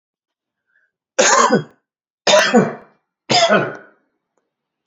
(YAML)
three_cough_length: 4.9 s
three_cough_amplitude: 30544
three_cough_signal_mean_std_ratio: 0.42
survey_phase: beta (2021-08-13 to 2022-03-07)
age: 45-64
gender: Male
wearing_mask: 'No'
symptom_none: true
smoker_status: Never smoked
respiratory_condition_asthma: false
respiratory_condition_other: false
recruitment_source: REACT
submission_delay: 3 days
covid_test_result: Negative
covid_test_method: RT-qPCR
influenza_a_test_result: Unknown/Void
influenza_b_test_result: Unknown/Void